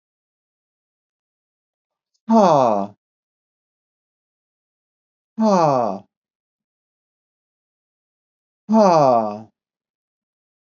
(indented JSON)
{
  "exhalation_length": "10.8 s",
  "exhalation_amplitude": 27226,
  "exhalation_signal_mean_std_ratio": 0.31,
  "survey_phase": "beta (2021-08-13 to 2022-03-07)",
  "age": "45-64",
  "gender": "Male",
  "wearing_mask": "No",
  "symptom_cough_any": true,
  "symptom_onset": "5 days",
  "smoker_status": "Ex-smoker",
  "respiratory_condition_asthma": false,
  "respiratory_condition_other": false,
  "recruitment_source": "Test and Trace",
  "submission_delay": "2 days",
  "covid_test_result": "Positive",
  "covid_test_method": "RT-qPCR",
  "covid_ct_value": 30.8,
  "covid_ct_gene": "ORF1ab gene"
}